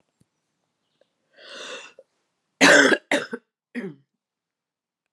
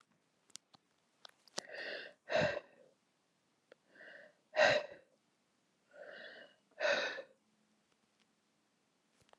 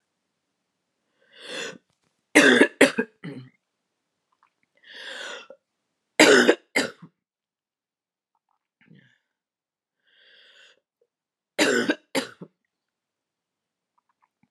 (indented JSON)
{
  "cough_length": "5.1 s",
  "cough_amplitude": 26843,
  "cough_signal_mean_std_ratio": 0.26,
  "exhalation_length": "9.4 s",
  "exhalation_amplitude": 5877,
  "exhalation_signal_mean_std_ratio": 0.29,
  "three_cough_length": "14.5 s",
  "three_cough_amplitude": 32000,
  "three_cough_signal_mean_std_ratio": 0.24,
  "survey_phase": "beta (2021-08-13 to 2022-03-07)",
  "age": "45-64",
  "gender": "Female",
  "wearing_mask": "No",
  "symptom_cough_any": true,
  "symptom_sore_throat": true,
  "symptom_fatigue": true,
  "symptom_headache": true,
  "symptom_onset": "1 day",
  "smoker_status": "Never smoked",
  "respiratory_condition_asthma": false,
  "respiratory_condition_other": false,
  "recruitment_source": "Test and Trace",
  "submission_delay": "1 day",
  "covid_test_result": "Positive",
  "covid_test_method": "RT-qPCR",
  "covid_ct_value": 26.4,
  "covid_ct_gene": "N gene"
}